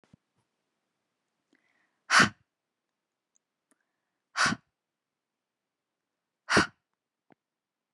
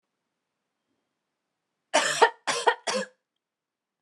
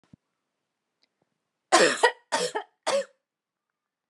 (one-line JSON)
{"exhalation_length": "7.9 s", "exhalation_amplitude": 13019, "exhalation_signal_mean_std_ratio": 0.19, "cough_length": "4.0 s", "cough_amplitude": 21071, "cough_signal_mean_std_ratio": 0.3, "three_cough_length": "4.1 s", "three_cough_amplitude": 18845, "three_cough_signal_mean_std_ratio": 0.31, "survey_phase": "alpha (2021-03-01 to 2021-08-12)", "age": "18-44", "gender": "Female", "wearing_mask": "No", "symptom_cough_any": true, "smoker_status": "Current smoker (e-cigarettes or vapes only)", "respiratory_condition_asthma": false, "respiratory_condition_other": false, "recruitment_source": "REACT", "submission_delay": "1 day", "covid_test_result": "Negative", "covid_test_method": "RT-qPCR"}